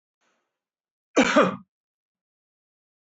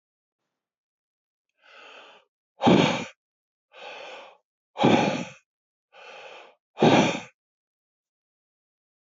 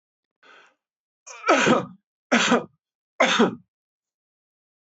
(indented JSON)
{
  "cough_length": "3.2 s",
  "cough_amplitude": 19709,
  "cough_signal_mean_std_ratio": 0.25,
  "exhalation_length": "9.0 s",
  "exhalation_amplitude": 18468,
  "exhalation_signal_mean_std_ratio": 0.3,
  "three_cough_length": "4.9 s",
  "three_cough_amplitude": 20241,
  "three_cough_signal_mean_std_ratio": 0.36,
  "survey_phase": "beta (2021-08-13 to 2022-03-07)",
  "age": "45-64",
  "gender": "Male",
  "wearing_mask": "No",
  "symptom_runny_or_blocked_nose": true,
  "symptom_fatigue": true,
  "smoker_status": "Ex-smoker",
  "respiratory_condition_asthma": false,
  "respiratory_condition_other": false,
  "recruitment_source": "REACT",
  "submission_delay": "13 days",
  "covid_test_result": "Negative",
  "covid_test_method": "RT-qPCR"
}